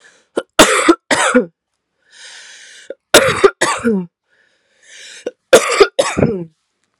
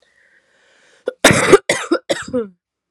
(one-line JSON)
{"three_cough_length": "7.0 s", "three_cough_amplitude": 32768, "three_cough_signal_mean_std_ratio": 0.42, "cough_length": "2.9 s", "cough_amplitude": 32768, "cough_signal_mean_std_ratio": 0.37, "survey_phase": "alpha (2021-03-01 to 2021-08-12)", "age": "18-44", "gender": "Female", "wearing_mask": "No", "symptom_cough_any": true, "symptom_shortness_of_breath": true, "symptom_diarrhoea": true, "symptom_fatigue": true, "symptom_headache": true, "symptom_change_to_sense_of_smell_or_taste": true, "symptom_onset": "3 days", "smoker_status": "Never smoked", "respiratory_condition_asthma": false, "respiratory_condition_other": false, "recruitment_source": "Test and Trace", "submission_delay": "2 days", "covid_test_result": "Positive", "covid_test_method": "RT-qPCR", "covid_ct_value": 13.7, "covid_ct_gene": "ORF1ab gene", "covid_ct_mean": 13.7, "covid_viral_load": "32000000 copies/ml", "covid_viral_load_category": "High viral load (>1M copies/ml)"}